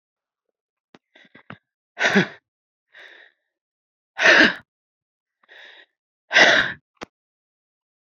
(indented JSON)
{
  "exhalation_length": "8.2 s",
  "exhalation_amplitude": 29540,
  "exhalation_signal_mean_std_ratio": 0.27,
  "survey_phase": "beta (2021-08-13 to 2022-03-07)",
  "age": "45-64",
  "gender": "Female",
  "wearing_mask": "No",
  "symptom_headache": true,
  "symptom_onset": "12 days",
  "smoker_status": "Ex-smoker",
  "respiratory_condition_asthma": false,
  "respiratory_condition_other": false,
  "recruitment_source": "REACT",
  "submission_delay": "2 days",
  "covid_test_result": "Negative",
  "covid_test_method": "RT-qPCR",
  "influenza_a_test_result": "Negative",
  "influenza_b_test_result": "Negative"
}